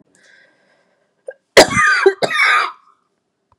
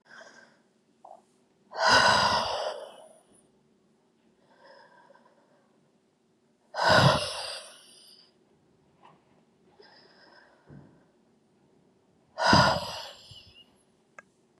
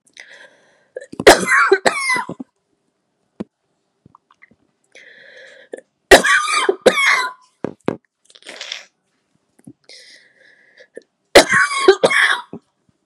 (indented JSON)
{
  "cough_length": "3.6 s",
  "cough_amplitude": 32768,
  "cough_signal_mean_std_ratio": 0.4,
  "exhalation_length": "14.6 s",
  "exhalation_amplitude": 18199,
  "exhalation_signal_mean_std_ratio": 0.31,
  "three_cough_length": "13.1 s",
  "three_cough_amplitude": 32768,
  "three_cough_signal_mean_std_ratio": 0.34,
  "survey_phase": "beta (2021-08-13 to 2022-03-07)",
  "age": "45-64",
  "gender": "Female",
  "wearing_mask": "No",
  "symptom_cough_any": true,
  "symptom_runny_or_blocked_nose": true,
  "symptom_fatigue": true,
  "symptom_onset": "8 days",
  "smoker_status": "Never smoked",
  "respiratory_condition_asthma": true,
  "respiratory_condition_other": false,
  "recruitment_source": "REACT",
  "submission_delay": "3 days",
  "covid_test_result": "Negative",
  "covid_test_method": "RT-qPCR",
  "influenza_a_test_result": "Negative",
  "influenza_b_test_result": "Negative"
}